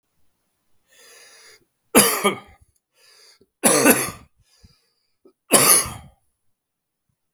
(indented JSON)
{
  "three_cough_length": "7.3 s",
  "three_cough_amplitude": 32768,
  "three_cough_signal_mean_std_ratio": 0.31,
  "survey_phase": "beta (2021-08-13 to 2022-03-07)",
  "age": "45-64",
  "gender": "Male",
  "wearing_mask": "No",
  "symptom_cough_any": true,
  "symptom_runny_or_blocked_nose": true,
  "symptom_fatigue": true,
  "symptom_headache": true,
  "symptom_change_to_sense_of_smell_or_taste": true,
  "symptom_onset": "3 days",
  "smoker_status": "Ex-smoker",
  "respiratory_condition_asthma": false,
  "respiratory_condition_other": false,
  "recruitment_source": "Test and Trace",
  "submission_delay": "2 days",
  "covid_test_result": "Positive",
  "covid_test_method": "RT-qPCR",
  "covid_ct_value": 17.9,
  "covid_ct_gene": "ORF1ab gene",
  "covid_ct_mean": 18.6,
  "covid_viral_load": "790000 copies/ml",
  "covid_viral_load_category": "Low viral load (10K-1M copies/ml)"
}